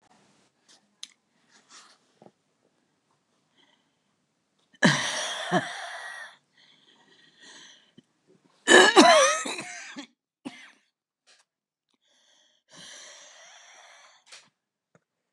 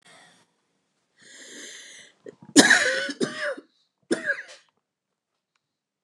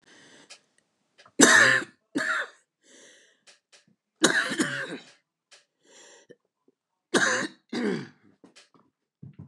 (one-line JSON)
{"exhalation_length": "15.3 s", "exhalation_amplitude": 28864, "exhalation_signal_mean_std_ratio": 0.24, "cough_length": "6.0 s", "cough_amplitude": 29203, "cough_signal_mean_std_ratio": 0.3, "three_cough_length": "9.5 s", "three_cough_amplitude": 29203, "three_cough_signal_mean_std_ratio": 0.33, "survey_phase": "beta (2021-08-13 to 2022-03-07)", "age": "45-64", "gender": "Female", "wearing_mask": "No", "symptom_cough_any": true, "symptom_new_continuous_cough": true, "symptom_runny_or_blocked_nose": true, "symptom_shortness_of_breath": true, "symptom_sore_throat": true, "symptom_fatigue": true, "symptom_fever_high_temperature": true, "symptom_headache": true, "symptom_other": true, "symptom_onset": "2 days", "smoker_status": "Ex-smoker", "respiratory_condition_asthma": false, "respiratory_condition_other": false, "recruitment_source": "Test and Trace", "submission_delay": "2 days", "covid_test_result": "Positive", "covid_test_method": "RT-qPCR"}